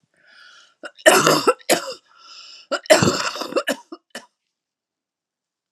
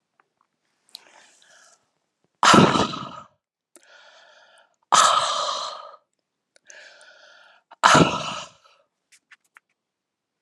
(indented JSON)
{
  "cough_length": "5.7 s",
  "cough_amplitude": 32759,
  "cough_signal_mean_std_ratio": 0.36,
  "exhalation_length": "10.4 s",
  "exhalation_amplitude": 32741,
  "exhalation_signal_mean_std_ratio": 0.3,
  "survey_phase": "alpha (2021-03-01 to 2021-08-12)",
  "age": "45-64",
  "gender": "Female",
  "wearing_mask": "No",
  "symptom_cough_any": true,
  "symptom_onset": "3 days",
  "smoker_status": "Never smoked",
  "respiratory_condition_asthma": false,
  "respiratory_condition_other": false,
  "recruitment_source": "Test and Trace",
  "submission_delay": "1 day",
  "covid_test_result": "Negative",
  "covid_test_method": "RT-qPCR"
}